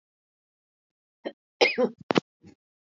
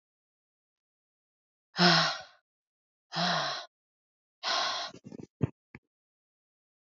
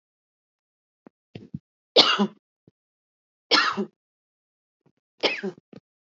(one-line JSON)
{"cough_length": "3.0 s", "cough_amplitude": 19732, "cough_signal_mean_std_ratio": 0.24, "exhalation_length": "6.9 s", "exhalation_amplitude": 11806, "exhalation_signal_mean_std_ratio": 0.33, "three_cough_length": "6.1 s", "three_cough_amplitude": 30295, "three_cough_signal_mean_std_ratio": 0.27, "survey_phase": "alpha (2021-03-01 to 2021-08-12)", "age": "45-64", "gender": "Female", "wearing_mask": "No", "symptom_none": true, "smoker_status": "Never smoked", "respiratory_condition_asthma": false, "respiratory_condition_other": false, "recruitment_source": "REACT", "submission_delay": "4 days", "covid_test_result": "Negative", "covid_test_method": "RT-qPCR"}